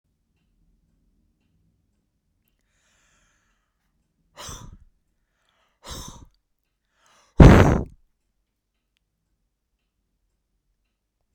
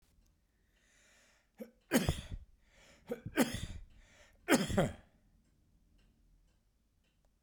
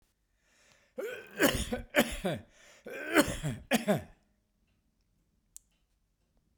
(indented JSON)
{
  "exhalation_length": "11.3 s",
  "exhalation_amplitude": 32768,
  "exhalation_signal_mean_std_ratio": 0.15,
  "three_cough_length": "7.4 s",
  "three_cough_amplitude": 8507,
  "three_cough_signal_mean_std_ratio": 0.3,
  "cough_length": "6.6 s",
  "cough_amplitude": 13563,
  "cough_signal_mean_std_ratio": 0.37,
  "survey_phase": "beta (2021-08-13 to 2022-03-07)",
  "age": "65+",
  "gender": "Male",
  "wearing_mask": "No",
  "symptom_none": true,
  "smoker_status": "Never smoked",
  "respiratory_condition_asthma": false,
  "respiratory_condition_other": false,
  "recruitment_source": "REACT",
  "submission_delay": "1 day",
  "covid_test_result": "Negative",
  "covid_test_method": "RT-qPCR"
}